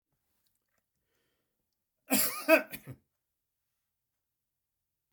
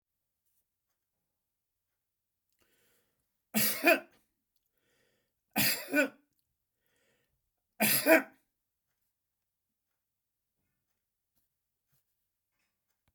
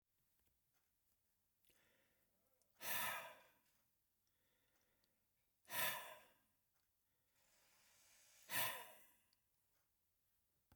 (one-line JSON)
{"cough_length": "5.1 s", "cough_amplitude": 10778, "cough_signal_mean_std_ratio": 0.21, "three_cough_length": "13.1 s", "three_cough_amplitude": 12075, "three_cough_signal_mean_std_ratio": 0.22, "exhalation_length": "10.8 s", "exhalation_amplitude": 1368, "exhalation_signal_mean_std_ratio": 0.29, "survey_phase": "beta (2021-08-13 to 2022-03-07)", "age": "65+", "gender": "Male", "wearing_mask": "No", "symptom_none": true, "smoker_status": "Ex-smoker", "respiratory_condition_asthma": false, "respiratory_condition_other": false, "recruitment_source": "REACT", "submission_delay": "4 days", "covid_test_result": "Negative", "covid_test_method": "RT-qPCR"}